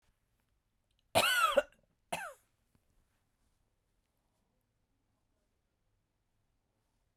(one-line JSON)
{"cough_length": "7.2 s", "cough_amplitude": 6102, "cough_signal_mean_std_ratio": 0.22, "survey_phase": "beta (2021-08-13 to 2022-03-07)", "age": "65+", "gender": "Female", "wearing_mask": "No", "symptom_none": true, "smoker_status": "Ex-smoker", "respiratory_condition_asthma": false, "respiratory_condition_other": false, "recruitment_source": "Test and Trace", "submission_delay": "2 days", "covid_test_result": "Negative", "covid_test_method": "RT-qPCR"}